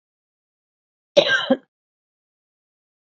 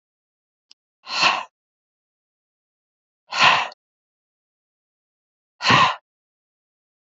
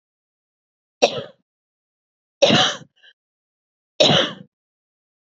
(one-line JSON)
{"cough_length": "3.2 s", "cough_amplitude": 28648, "cough_signal_mean_std_ratio": 0.23, "exhalation_length": "7.2 s", "exhalation_amplitude": 27885, "exhalation_signal_mean_std_ratio": 0.27, "three_cough_length": "5.2 s", "three_cough_amplitude": 32767, "three_cough_signal_mean_std_ratio": 0.29, "survey_phase": "beta (2021-08-13 to 2022-03-07)", "age": "45-64", "gender": "Female", "wearing_mask": "No", "symptom_none": true, "smoker_status": "Current smoker (1 to 10 cigarettes per day)", "respiratory_condition_asthma": false, "respiratory_condition_other": false, "recruitment_source": "REACT", "submission_delay": "3 days", "covid_test_result": "Negative", "covid_test_method": "RT-qPCR", "influenza_a_test_result": "Negative", "influenza_b_test_result": "Negative"}